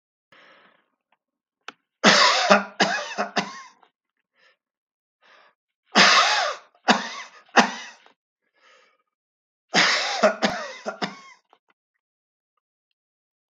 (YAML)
three_cough_length: 13.6 s
three_cough_amplitude: 32215
three_cough_signal_mean_std_ratio: 0.35
survey_phase: beta (2021-08-13 to 2022-03-07)
age: 65+
gender: Male
wearing_mask: 'No'
symptom_none: true
smoker_status: Ex-smoker
respiratory_condition_asthma: false
respiratory_condition_other: false
recruitment_source: REACT
submission_delay: 2 days
covid_test_result: Negative
covid_test_method: RT-qPCR
influenza_a_test_result: Negative
influenza_b_test_result: Negative